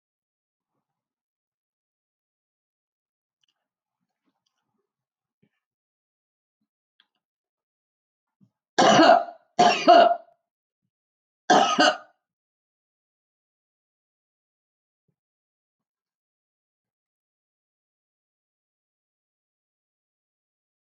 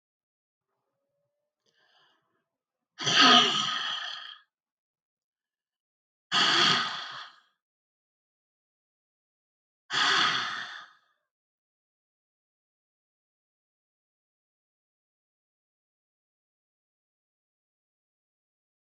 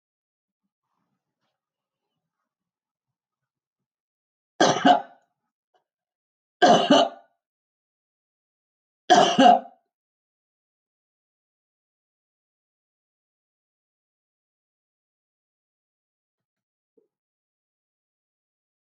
{
  "cough_length": "21.0 s",
  "cough_amplitude": 22707,
  "cough_signal_mean_std_ratio": 0.2,
  "exhalation_length": "18.9 s",
  "exhalation_amplitude": 16374,
  "exhalation_signal_mean_std_ratio": 0.27,
  "three_cough_length": "18.9 s",
  "three_cough_amplitude": 20334,
  "three_cough_signal_mean_std_ratio": 0.2,
  "survey_phase": "alpha (2021-03-01 to 2021-08-12)",
  "age": "65+",
  "gender": "Female",
  "wearing_mask": "No",
  "symptom_none": true,
  "smoker_status": "Current smoker (1 to 10 cigarettes per day)",
  "respiratory_condition_asthma": false,
  "respiratory_condition_other": false,
  "recruitment_source": "REACT",
  "submission_delay": "5 days",
  "covid_test_result": "Negative",
  "covid_test_method": "RT-qPCR"
}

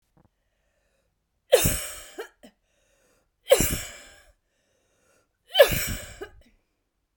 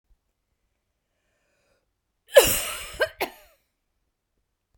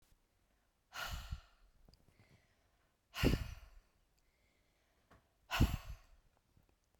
{
  "three_cough_length": "7.2 s",
  "three_cough_amplitude": 26993,
  "three_cough_signal_mean_std_ratio": 0.27,
  "cough_length": "4.8 s",
  "cough_amplitude": 30393,
  "cough_signal_mean_std_ratio": 0.21,
  "exhalation_length": "7.0 s",
  "exhalation_amplitude": 3839,
  "exhalation_signal_mean_std_ratio": 0.28,
  "survey_phase": "beta (2021-08-13 to 2022-03-07)",
  "age": "45-64",
  "gender": "Female",
  "wearing_mask": "No",
  "symptom_none": true,
  "smoker_status": "Ex-smoker",
  "respiratory_condition_asthma": false,
  "respiratory_condition_other": false,
  "recruitment_source": "Test and Trace",
  "submission_delay": "1 day",
  "covid_test_result": "Negative",
  "covid_test_method": "RT-qPCR"
}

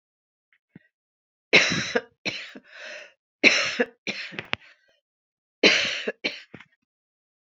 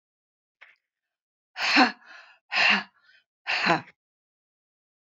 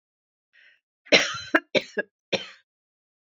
{
  "three_cough_length": "7.4 s",
  "three_cough_amplitude": 27486,
  "three_cough_signal_mean_std_ratio": 0.33,
  "exhalation_length": "5.0 s",
  "exhalation_amplitude": 19647,
  "exhalation_signal_mean_std_ratio": 0.33,
  "cough_length": "3.2 s",
  "cough_amplitude": 26752,
  "cough_signal_mean_std_ratio": 0.27,
  "survey_phase": "beta (2021-08-13 to 2022-03-07)",
  "age": "65+",
  "gender": "Female",
  "wearing_mask": "No",
  "symptom_none": true,
  "smoker_status": "Ex-smoker",
  "respiratory_condition_asthma": false,
  "respiratory_condition_other": false,
  "recruitment_source": "REACT",
  "submission_delay": "2 days",
  "covid_test_result": "Negative",
  "covid_test_method": "RT-qPCR",
  "influenza_a_test_result": "Negative",
  "influenza_b_test_result": "Negative"
}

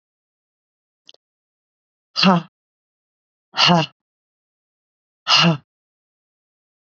{
  "exhalation_length": "6.9 s",
  "exhalation_amplitude": 29968,
  "exhalation_signal_mean_std_ratio": 0.27,
  "survey_phase": "beta (2021-08-13 to 2022-03-07)",
  "age": "45-64",
  "gender": "Female",
  "wearing_mask": "No",
  "symptom_cough_any": true,
  "symptom_runny_or_blocked_nose": true,
  "symptom_shortness_of_breath": true,
  "symptom_fatigue": true,
  "symptom_headache": true,
  "symptom_other": true,
  "symptom_onset": "2 days",
  "smoker_status": "Ex-smoker",
  "respiratory_condition_asthma": false,
  "respiratory_condition_other": false,
  "recruitment_source": "Test and Trace",
  "submission_delay": "0 days",
  "covid_test_result": "Positive",
  "covid_test_method": "RT-qPCR",
  "covid_ct_value": 15.0,
  "covid_ct_gene": "ORF1ab gene",
  "covid_ct_mean": 15.4,
  "covid_viral_load": "9100000 copies/ml",
  "covid_viral_load_category": "High viral load (>1M copies/ml)"
}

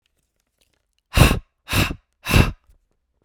{
  "exhalation_length": "3.2 s",
  "exhalation_amplitude": 32768,
  "exhalation_signal_mean_std_ratio": 0.33,
  "survey_phase": "beta (2021-08-13 to 2022-03-07)",
  "age": "18-44",
  "gender": "Male",
  "wearing_mask": "No",
  "symptom_cough_any": true,
  "symptom_new_continuous_cough": true,
  "symptom_runny_or_blocked_nose": true,
  "symptom_sore_throat": true,
  "symptom_fatigue": true,
  "symptom_headache": true,
  "symptom_onset": "2 days",
  "smoker_status": "Never smoked",
  "respiratory_condition_asthma": false,
  "respiratory_condition_other": false,
  "recruitment_source": "Test and Trace",
  "submission_delay": "2 days",
  "covid_test_result": "Positive",
  "covid_test_method": "RT-qPCR",
  "covid_ct_value": 31.0,
  "covid_ct_gene": "N gene"
}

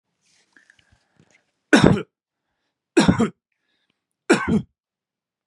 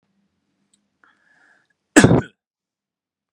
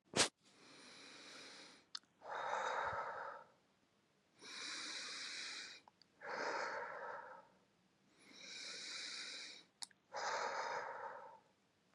{
  "three_cough_length": "5.5 s",
  "three_cough_amplitude": 32768,
  "three_cough_signal_mean_std_ratio": 0.29,
  "cough_length": "3.3 s",
  "cough_amplitude": 32768,
  "cough_signal_mean_std_ratio": 0.2,
  "exhalation_length": "11.9 s",
  "exhalation_amplitude": 3380,
  "exhalation_signal_mean_std_ratio": 0.6,
  "survey_phase": "beta (2021-08-13 to 2022-03-07)",
  "age": "18-44",
  "gender": "Male",
  "wearing_mask": "No",
  "symptom_none": true,
  "smoker_status": "Never smoked",
  "respiratory_condition_asthma": false,
  "respiratory_condition_other": false,
  "recruitment_source": "REACT",
  "submission_delay": "2 days",
  "covid_test_result": "Negative",
  "covid_test_method": "RT-qPCR",
  "influenza_a_test_result": "Negative",
  "influenza_b_test_result": "Negative"
}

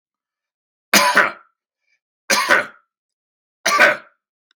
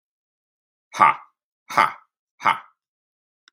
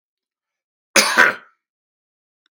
{
  "three_cough_length": "4.6 s",
  "three_cough_amplitude": 32768,
  "three_cough_signal_mean_std_ratio": 0.37,
  "exhalation_length": "3.5 s",
  "exhalation_amplitude": 32767,
  "exhalation_signal_mean_std_ratio": 0.25,
  "cough_length": "2.5 s",
  "cough_amplitude": 32767,
  "cough_signal_mean_std_ratio": 0.28,
  "survey_phase": "beta (2021-08-13 to 2022-03-07)",
  "age": "45-64",
  "gender": "Male",
  "wearing_mask": "No",
  "symptom_none": true,
  "smoker_status": "Never smoked",
  "respiratory_condition_asthma": false,
  "respiratory_condition_other": false,
  "recruitment_source": "REACT",
  "submission_delay": "2 days",
  "covid_test_result": "Negative",
  "covid_test_method": "RT-qPCR",
  "influenza_a_test_result": "Negative",
  "influenza_b_test_result": "Negative"
}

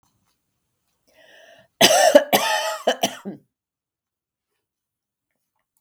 {
  "cough_length": "5.8 s",
  "cough_amplitude": 32768,
  "cough_signal_mean_std_ratio": 0.3,
  "survey_phase": "beta (2021-08-13 to 2022-03-07)",
  "age": "65+",
  "gender": "Female",
  "wearing_mask": "No",
  "symptom_none": true,
  "smoker_status": "Never smoked",
  "respiratory_condition_asthma": false,
  "respiratory_condition_other": false,
  "recruitment_source": "REACT",
  "submission_delay": "3 days",
  "covid_test_result": "Negative",
  "covid_test_method": "RT-qPCR",
  "influenza_a_test_result": "Unknown/Void",
  "influenza_b_test_result": "Unknown/Void"
}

